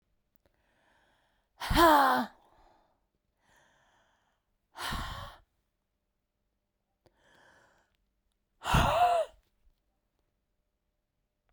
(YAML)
exhalation_length: 11.5 s
exhalation_amplitude: 11727
exhalation_signal_mean_std_ratio: 0.28
survey_phase: beta (2021-08-13 to 2022-03-07)
age: 45-64
gender: Female
wearing_mask: 'No'
symptom_cough_any: true
symptom_sore_throat: true
symptom_fatigue: true
symptom_headache: true
symptom_onset: 3 days
smoker_status: Ex-smoker
respiratory_condition_asthma: false
respiratory_condition_other: false
recruitment_source: Test and Trace
submission_delay: 1 day
covid_test_result: Positive
covid_test_method: RT-qPCR
covid_ct_value: 17.9
covid_ct_gene: N gene
covid_ct_mean: 18.8
covid_viral_load: 660000 copies/ml
covid_viral_load_category: Low viral load (10K-1M copies/ml)